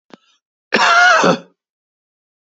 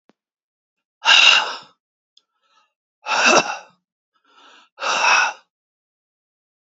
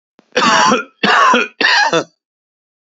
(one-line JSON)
{"cough_length": "2.6 s", "cough_amplitude": 32767, "cough_signal_mean_std_ratio": 0.42, "exhalation_length": "6.7 s", "exhalation_amplitude": 32152, "exhalation_signal_mean_std_ratio": 0.35, "three_cough_length": "2.9 s", "three_cough_amplitude": 32724, "three_cough_signal_mean_std_ratio": 0.62, "survey_phase": "beta (2021-08-13 to 2022-03-07)", "age": "45-64", "gender": "Male", "wearing_mask": "No", "symptom_cough_any": true, "symptom_runny_or_blocked_nose": true, "symptom_sore_throat": true, "symptom_abdominal_pain": true, "symptom_fatigue": true, "symptom_fever_high_temperature": true, "symptom_headache": true, "symptom_change_to_sense_of_smell_or_taste": true, "symptom_loss_of_taste": true, "symptom_onset": "3 days", "smoker_status": "Never smoked", "respiratory_condition_asthma": false, "respiratory_condition_other": false, "recruitment_source": "Test and Trace", "submission_delay": "1 day", "covid_test_result": "Positive", "covid_test_method": "RT-qPCR", "covid_ct_value": 18.3, "covid_ct_gene": "ORF1ab gene", "covid_ct_mean": 18.5, "covid_viral_load": "850000 copies/ml", "covid_viral_load_category": "Low viral load (10K-1M copies/ml)"}